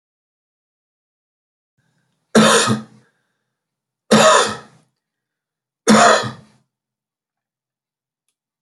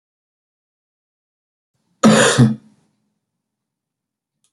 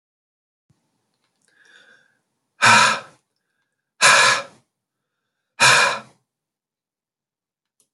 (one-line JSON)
{"three_cough_length": "8.6 s", "three_cough_amplitude": 31350, "three_cough_signal_mean_std_ratio": 0.31, "cough_length": "4.5 s", "cough_amplitude": 29949, "cough_signal_mean_std_ratio": 0.26, "exhalation_length": "7.9 s", "exhalation_amplitude": 30916, "exhalation_signal_mean_std_ratio": 0.3, "survey_phase": "beta (2021-08-13 to 2022-03-07)", "age": "65+", "gender": "Male", "wearing_mask": "No", "symptom_cough_any": true, "symptom_runny_or_blocked_nose": true, "symptom_fatigue": true, "smoker_status": "Never smoked", "respiratory_condition_asthma": false, "respiratory_condition_other": false, "recruitment_source": "Test and Trace", "submission_delay": "1 day", "covid_test_result": "Positive", "covid_test_method": "RT-qPCR", "covid_ct_value": 22.7, "covid_ct_gene": "ORF1ab gene", "covid_ct_mean": 23.5, "covid_viral_load": "19000 copies/ml", "covid_viral_load_category": "Low viral load (10K-1M copies/ml)"}